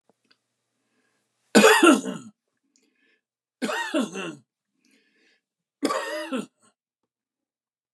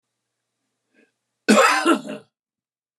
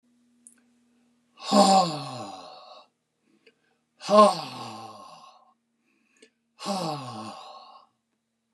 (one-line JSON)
{"three_cough_length": "7.9 s", "three_cough_amplitude": 26699, "three_cough_signal_mean_std_ratio": 0.29, "cough_length": "3.0 s", "cough_amplitude": 24684, "cough_signal_mean_std_ratio": 0.34, "exhalation_length": "8.5 s", "exhalation_amplitude": 23015, "exhalation_signal_mean_std_ratio": 0.31, "survey_phase": "beta (2021-08-13 to 2022-03-07)", "age": "65+", "gender": "Male", "wearing_mask": "No", "symptom_headache": true, "smoker_status": "Never smoked", "respiratory_condition_asthma": false, "respiratory_condition_other": false, "recruitment_source": "REACT", "submission_delay": "2 days", "covid_test_result": "Negative", "covid_test_method": "RT-qPCR"}